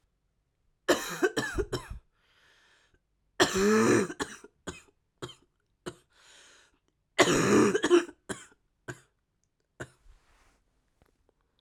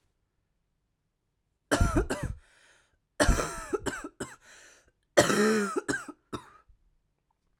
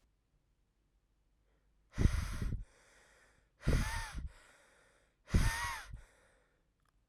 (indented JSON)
{
  "three_cough_length": "11.6 s",
  "three_cough_amplitude": 16907,
  "three_cough_signal_mean_std_ratio": 0.36,
  "cough_length": "7.6 s",
  "cough_amplitude": 18299,
  "cough_signal_mean_std_ratio": 0.38,
  "exhalation_length": "7.1 s",
  "exhalation_amplitude": 5920,
  "exhalation_signal_mean_std_ratio": 0.36,
  "survey_phase": "alpha (2021-03-01 to 2021-08-12)",
  "age": "18-44",
  "gender": "Male",
  "wearing_mask": "No",
  "symptom_cough_any": true,
  "symptom_new_continuous_cough": true,
  "symptom_shortness_of_breath": true,
  "symptom_abdominal_pain": true,
  "symptom_fatigue": true,
  "symptom_fever_high_temperature": true,
  "symptom_headache": true,
  "symptom_change_to_sense_of_smell_or_taste": true,
  "symptom_loss_of_taste": true,
  "symptom_onset": "4 days",
  "smoker_status": "Never smoked",
  "respiratory_condition_asthma": false,
  "respiratory_condition_other": false,
  "recruitment_source": "Test and Trace",
  "submission_delay": "3 days",
  "covid_test_result": "Positive",
  "covid_test_method": "RT-qPCR"
}